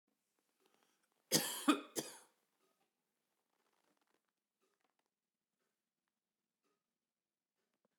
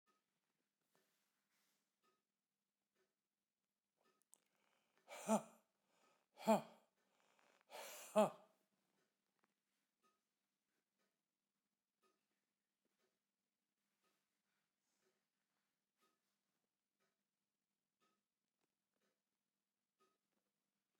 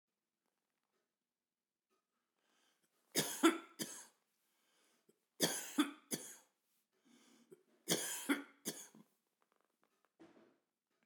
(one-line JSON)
{"cough_length": "8.0 s", "cough_amplitude": 4590, "cough_signal_mean_std_ratio": 0.17, "exhalation_length": "21.0 s", "exhalation_amplitude": 2289, "exhalation_signal_mean_std_ratio": 0.13, "three_cough_length": "11.1 s", "three_cough_amplitude": 5152, "three_cough_signal_mean_std_ratio": 0.26, "survey_phase": "beta (2021-08-13 to 2022-03-07)", "age": "65+", "gender": "Male", "wearing_mask": "No", "symptom_none": true, "smoker_status": "Never smoked", "respiratory_condition_asthma": false, "respiratory_condition_other": false, "recruitment_source": "REACT", "submission_delay": "2 days", "covid_test_result": "Negative", "covid_test_method": "RT-qPCR"}